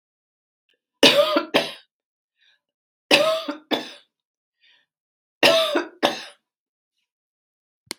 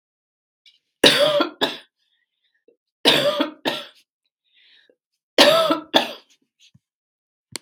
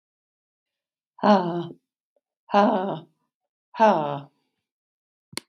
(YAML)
cough_length: 8.0 s
cough_amplitude: 32768
cough_signal_mean_std_ratio: 0.33
three_cough_length: 7.6 s
three_cough_amplitude: 32767
three_cough_signal_mean_std_ratio: 0.36
exhalation_length: 5.5 s
exhalation_amplitude: 20013
exhalation_signal_mean_std_ratio: 0.34
survey_phase: beta (2021-08-13 to 2022-03-07)
age: 45-64
gender: Female
wearing_mask: 'No'
symptom_none: true
symptom_onset: 11 days
smoker_status: Never smoked
respiratory_condition_asthma: false
respiratory_condition_other: false
recruitment_source: REACT
submission_delay: 3 days
covid_test_result: Negative
covid_test_method: RT-qPCR
influenza_a_test_result: Negative
influenza_b_test_result: Negative